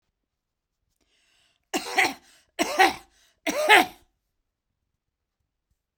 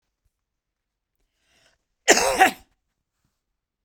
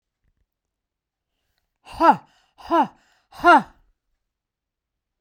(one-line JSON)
{"three_cough_length": "6.0 s", "three_cough_amplitude": 25826, "three_cough_signal_mean_std_ratio": 0.28, "cough_length": "3.8 s", "cough_amplitude": 32767, "cough_signal_mean_std_ratio": 0.24, "exhalation_length": "5.2 s", "exhalation_amplitude": 25660, "exhalation_signal_mean_std_ratio": 0.24, "survey_phase": "beta (2021-08-13 to 2022-03-07)", "age": "45-64", "gender": "Female", "wearing_mask": "No", "symptom_none": true, "smoker_status": "Ex-smoker", "respiratory_condition_asthma": false, "respiratory_condition_other": false, "recruitment_source": "REACT", "submission_delay": "8 days", "covid_test_result": "Negative", "covid_test_method": "RT-qPCR"}